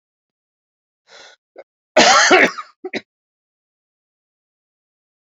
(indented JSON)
{
  "cough_length": "5.3 s",
  "cough_amplitude": 30994,
  "cough_signal_mean_std_ratio": 0.27,
  "survey_phase": "beta (2021-08-13 to 2022-03-07)",
  "age": "65+",
  "gender": "Male",
  "wearing_mask": "No",
  "symptom_cough_any": true,
  "symptom_runny_or_blocked_nose": true,
  "symptom_sore_throat": true,
  "symptom_fatigue": true,
  "symptom_fever_high_temperature": true,
  "symptom_headache": true,
  "symptom_change_to_sense_of_smell_or_taste": true,
  "symptom_onset": "2 days",
  "smoker_status": "Ex-smoker",
  "respiratory_condition_asthma": false,
  "respiratory_condition_other": false,
  "recruitment_source": "Test and Trace",
  "submission_delay": "1 day",
  "covid_test_result": "Positive",
  "covid_test_method": "RT-qPCR"
}